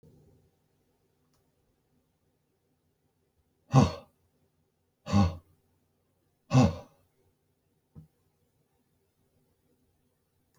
{"exhalation_length": "10.6 s", "exhalation_amplitude": 12843, "exhalation_signal_mean_std_ratio": 0.19, "survey_phase": "beta (2021-08-13 to 2022-03-07)", "age": "65+", "gender": "Male", "wearing_mask": "No", "symptom_headache": true, "symptom_onset": "12 days", "smoker_status": "Ex-smoker", "respiratory_condition_asthma": false, "respiratory_condition_other": false, "recruitment_source": "REACT", "submission_delay": "3 days", "covid_test_result": "Negative", "covid_test_method": "RT-qPCR"}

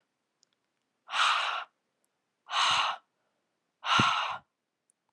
{"exhalation_length": "5.1 s", "exhalation_amplitude": 10758, "exhalation_signal_mean_std_ratio": 0.44, "survey_phase": "alpha (2021-03-01 to 2021-08-12)", "age": "18-44", "gender": "Female", "wearing_mask": "No", "symptom_cough_any": true, "symptom_new_continuous_cough": true, "symptom_fatigue": true, "symptom_headache": true, "symptom_onset": "6 days", "smoker_status": "Never smoked", "respiratory_condition_asthma": false, "respiratory_condition_other": false, "recruitment_source": "Test and Trace", "submission_delay": "2 days", "covid_test_result": "Positive", "covid_test_method": "RT-qPCR", "covid_ct_value": 17.3, "covid_ct_gene": "ORF1ab gene", "covid_ct_mean": 18.3, "covid_viral_load": "1000000 copies/ml", "covid_viral_load_category": "High viral load (>1M copies/ml)"}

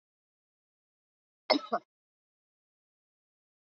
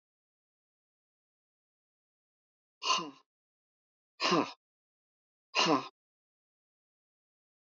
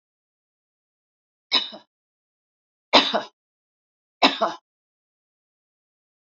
{"cough_length": "3.8 s", "cough_amplitude": 10223, "cough_signal_mean_std_ratio": 0.15, "exhalation_length": "7.8 s", "exhalation_amplitude": 7810, "exhalation_signal_mean_std_ratio": 0.24, "three_cough_length": "6.4 s", "three_cough_amplitude": 29029, "three_cough_signal_mean_std_ratio": 0.22, "survey_phase": "alpha (2021-03-01 to 2021-08-12)", "age": "65+", "gender": "Female", "wearing_mask": "No", "symptom_none": true, "smoker_status": "Ex-smoker", "respiratory_condition_asthma": false, "respiratory_condition_other": false, "recruitment_source": "REACT", "submission_delay": "1 day", "covid_test_result": "Negative", "covid_test_method": "RT-qPCR"}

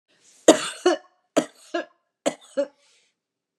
{"three_cough_length": "3.6 s", "three_cough_amplitude": 32198, "three_cough_signal_mean_std_ratio": 0.27, "survey_phase": "beta (2021-08-13 to 2022-03-07)", "age": "65+", "gender": "Female", "wearing_mask": "No", "symptom_cough_any": true, "smoker_status": "Ex-smoker", "respiratory_condition_asthma": false, "respiratory_condition_other": false, "recruitment_source": "REACT", "submission_delay": "2 days", "covid_test_result": "Negative", "covid_test_method": "RT-qPCR", "influenza_a_test_result": "Negative", "influenza_b_test_result": "Negative"}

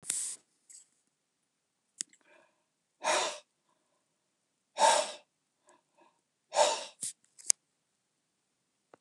{"exhalation_length": "9.0 s", "exhalation_amplitude": 27119, "exhalation_signal_mean_std_ratio": 0.26, "survey_phase": "beta (2021-08-13 to 2022-03-07)", "age": "65+", "gender": "Male", "wearing_mask": "No", "symptom_none": true, "smoker_status": "Ex-smoker", "respiratory_condition_asthma": false, "respiratory_condition_other": false, "recruitment_source": "REACT", "submission_delay": "1 day", "covid_test_result": "Negative", "covid_test_method": "RT-qPCR", "influenza_a_test_result": "Negative", "influenza_b_test_result": "Negative"}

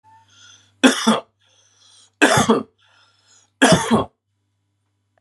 {"three_cough_length": "5.2 s", "three_cough_amplitude": 32768, "three_cough_signal_mean_std_ratio": 0.36, "survey_phase": "beta (2021-08-13 to 2022-03-07)", "age": "45-64", "gender": "Male", "wearing_mask": "No", "symptom_sore_throat": true, "smoker_status": "Never smoked", "respiratory_condition_asthma": false, "respiratory_condition_other": false, "recruitment_source": "Test and Trace", "submission_delay": "1 day", "covid_test_result": "Positive", "covid_test_method": "RT-qPCR", "covid_ct_value": 31.1, "covid_ct_gene": "ORF1ab gene", "covid_ct_mean": 31.1, "covid_viral_load": "61 copies/ml", "covid_viral_load_category": "Minimal viral load (< 10K copies/ml)"}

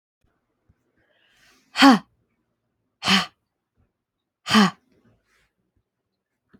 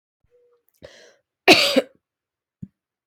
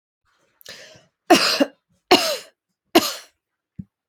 {"exhalation_length": "6.6 s", "exhalation_amplitude": 27198, "exhalation_signal_mean_std_ratio": 0.23, "cough_length": "3.1 s", "cough_amplitude": 30184, "cough_signal_mean_std_ratio": 0.24, "three_cough_length": "4.1 s", "three_cough_amplitude": 31982, "three_cough_signal_mean_std_ratio": 0.31, "survey_phase": "beta (2021-08-13 to 2022-03-07)", "age": "18-44", "gender": "Female", "wearing_mask": "No", "symptom_runny_or_blocked_nose": true, "symptom_headache": true, "smoker_status": "Ex-smoker", "respiratory_condition_asthma": false, "respiratory_condition_other": false, "recruitment_source": "Test and Trace", "submission_delay": "2 days", "covid_test_result": "Positive", "covid_test_method": "RT-qPCR", "covid_ct_value": 29.5, "covid_ct_gene": "ORF1ab gene", "covid_ct_mean": 30.2, "covid_viral_load": "120 copies/ml", "covid_viral_load_category": "Minimal viral load (< 10K copies/ml)"}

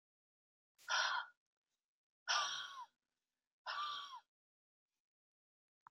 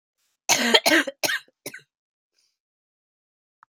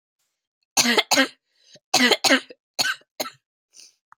{"exhalation_length": "5.9 s", "exhalation_amplitude": 1996, "exhalation_signal_mean_std_ratio": 0.36, "cough_length": "3.7 s", "cough_amplitude": 27851, "cough_signal_mean_std_ratio": 0.31, "three_cough_length": "4.2 s", "three_cough_amplitude": 28763, "three_cough_signal_mean_std_ratio": 0.37, "survey_phase": "beta (2021-08-13 to 2022-03-07)", "age": "18-44", "gender": "Female", "wearing_mask": "No", "symptom_cough_any": true, "symptom_runny_or_blocked_nose": true, "symptom_sore_throat": true, "symptom_fatigue": true, "symptom_headache": true, "symptom_onset": "3 days", "smoker_status": "Never smoked", "respiratory_condition_asthma": false, "respiratory_condition_other": false, "recruitment_source": "Test and Trace", "submission_delay": "2 days", "covid_test_result": "Positive", "covid_test_method": "RT-qPCR", "covid_ct_value": 30.3, "covid_ct_gene": "ORF1ab gene"}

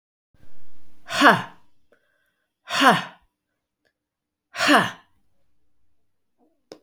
{"exhalation_length": "6.8 s", "exhalation_amplitude": 29810, "exhalation_signal_mean_std_ratio": 0.34, "survey_phase": "beta (2021-08-13 to 2022-03-07)", "age": "45-64", "gender": "Female", "wearing_mask": "No", "symptom_none": true, "smoker_status": "Current smoker (1 to 10 cigarettes per day)", "respiratory_condition_asthma": false, "respiratory_condition_other": false, "recruitment_source": "REACT", "submission_delay": "5 days", "covid_test_result": "Negative", "covid_test_method": "RT-qPCR"}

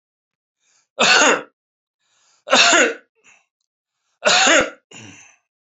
{"three_cough_length": "5.7 s", "three_cough_amplitude": 32767, "three_cough_signal_mean_std_ratio": 0.39, "survey_phase": "beta (2021-08-13 to 2022-03-07)", "age": "45-64", "gender": "Male", "wearing_mask": "No", "symptom_none": true, "smoker_status": "Never smoked", "respiratory_condition_asthma": false, "respiratory_condition_other": false, "recruitment_source": "REACT", "submission_delay": "2 days", "covid_test_result": "Negative", "covid_test_method": "RT-qPCR", "influenza_a_test_result": "Negative", "influenza_b_test_result": "Negative"}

